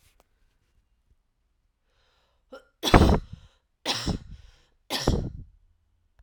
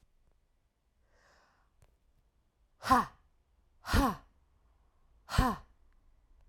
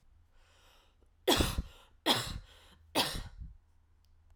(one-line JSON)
{"three_cough_length": "6.2 s", "three_cough_amplitude": 31652, "three_cough_signal_mean_std_ratio": 0.27, "exhalation_length": "6.5 s", "exhalation_amplitude": 8310, "exhalation_signal_mean_std_ratio": 0.26, "cough_length": "4.4 s", "cough_amplitude": 6931, "cough_signal_mean_std_ratio": 0.38, "survey_phase": "alpha (2021-03-01 to 2021-08-12)", "age": "18-44", "gender": "Female", "wearing_mask": "No", "symptom_cough_any": true, "symptom_fatigue": true, "symptom_headache": true, "symptom_change_to_sense_of_smell_or_taste": true, "symptom_loss_of_taste": true, "smoker_status": "Never smoked", "respiratory_condition_asthma": false, "respiratory_condition_other": false, "recruitment_source": "Test and Trace", "submission_delay": "2 days", "covid_test_result": "Positive", "covid_test_method": "RT-qPCR", "covid_ct_value": 15.8, "covid_ct_gene": "ORF1ab gene", "covid_ct_mean": 16.5, "covid_viral_load": "3900000 copies/ml", "covid_viral_load_category": "High viral load (>1M copies/ml)"}